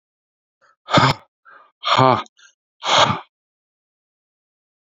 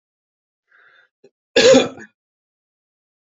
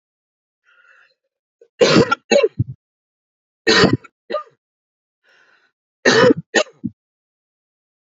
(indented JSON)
{
  "exhalation_length": "4.9 s",
  "exhalation_amplitude": 28082,
  "exhalation_signal_mean_std_ratio": 0.33,
  "cough_length": "3.3 s",
  "cough_amplitude": 32278,
  "cough_signal_mean_std_ratio": 0.25,
  "three_cough_length": "8.0 s",
  "three_cough_amplitude": 28991,
  "three_cough_signal_mean_std_ratio": 0.32,
  "survey_phase": "beta (2021-08-13 to 2022-03-07)",
  "age": "18-44",
  "gender": "Male",
  "wearing_mask": "No",
  "symptom_none": true,
  "smoker_status": "Never smoked",
  "respiratory_condition_asthma": false,
  "respiratory_condition_other": false,
  "recruitment_source": "REACT",
  "submission_delay": "2 days",
  "covid_test_result": "Negative",
  "covid_test_method": "RT-qPCR",
  "influenza_a_test_result": "Negative",
  "influenza_b_test_result": "Negative"
}